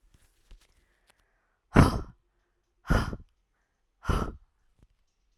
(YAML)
exhalation_length: 5.4 s
exhalation_amplitude: 20654
exhalation_signal_mean_std_ratio: 0.25
survey_phase: alpha (2021-03-01 to 2021-08-12)
age: 18-44
gender: Female
wearing_mask: 'No'
symptom_cough_any: true
symptom_new_continuous_cough: true
symptom_shortness_of_breath: true
symptom_fatigue: true
symptom_fever_high_temperature: true
symptom_change_to_sense_of_smell_or_taste: true
symptom_onset: 4 days
smoker_status: Never smoked
respiratory_condition_asthma: false
respiratory_condition_other: false
recruitment_source: Test and Trace
submission_delay: 2 days
covid_test_result: Positive
covid_test_method: RT-qPCR